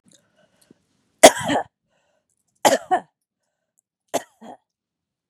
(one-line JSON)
{"three_cough_length": "5.3 s", "three_cough_amplitude": 32768, "three_cough_signal_mean_std_ratio": 0.2, "survey_phase": "beta (2021-08-13 to 2022-03-07)", "age": "45-64", "gender": "Female", "wearing_mask": "No", "symptom_none": true, "smoker_status": "Never smoked", "respiratory_condition_asthma": false, "respiratory_condition_other": false, "recruitment_source": "REACT", "submission_delay": "1 day", "covid_test_result": "Negative", "covid_test_method": "RT-qPCR", "influenza_a_test_result": "Negative", "influenza_b_test_result": "Negative"}